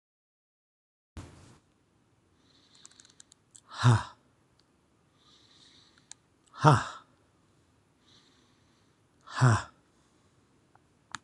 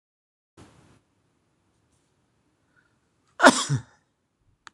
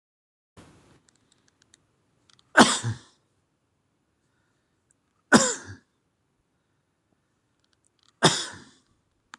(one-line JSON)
{"exhalation_length": "11.2 s", "exhalation_amplitude": 20527, "exhalation_signal_mean_std_ratio": 0.21, "cough_length": "4.7 s", "cough_amplitude": 26028, "cough_signal_mean_std_ratio": 0.17, "three_cough_length": "9.4 s", "three_cough_amplitude": 26027, "three_cough_signal_mean_std_ratio": 0.2, "survey_phase": "alpha (2021-03-01 to 2021-08-12)", "age": "65+", "gender": "Male", "wearing_mask": "No", "symptom_none": true, "symptom_onset": "12 days", "smoker_status": "Ex-smoker", "respiratory_condition_asthma": false, "respiratory_condition_other": false, "recruitment_source": "REACT", "submission_delay": "1 day", "covid_test_result": "Negative", "covid_test_method": "RT-qPCR"}